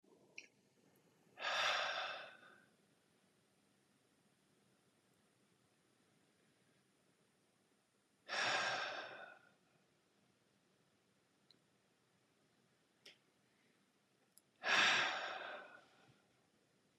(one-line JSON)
{"exhalation_length": "17.0 s", "exhalation_amplitude": 2804, "exhalation_signal_mean_std_ratio": 0.32, "survey_phase": "beta (2021-08-13 to 2022-03-07)", "age": "45-64", "gender": "Male", "wearing_mask": "No", "symptom_none": true, "smoker_status": "Ex-smoker", "respiratory_condition_asthma": false, "respiratory_condition_other": false, "recruitment_source": "REACT", "submission_delay": "3 days", "covid_test_result": "Negative", "covid_test_method": "RT-qPCR", "influenza_a_test_result": "Unknown/Void", "influenza_b_test_result": "Unknown/Void"}